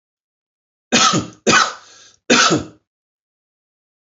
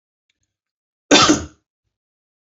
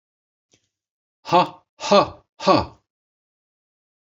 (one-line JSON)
{"three_cough_length": "4.1 s", "three_cough_amplitude": 31614, "three_cough_signal_mean_std_ratio": 0.38, "cough_length": "2.5 s", "cough_amplitude": 29878, "cough_signal_mean_std_ratio": 0.27, "exhalation_length": "4.1 s", "exhalation_amplitude": 26952, "exhalation_signal_mean_std_ratio": 0.28, "survey_phase": "beta (2021-08-13 to 2022-03-07)", "age": "65+", "gender": "Male", "wearing_mask": "No", "symptom_none": true, "smoker_status": "Never smoked", "respiratory_condition_asthma": false, "respiratory_condition_other": false, "recruitment_source": "REACT", "submission_delay": "3 days", "covid_test_result": "Negative", "covid_test_method": "RT-qPCR"}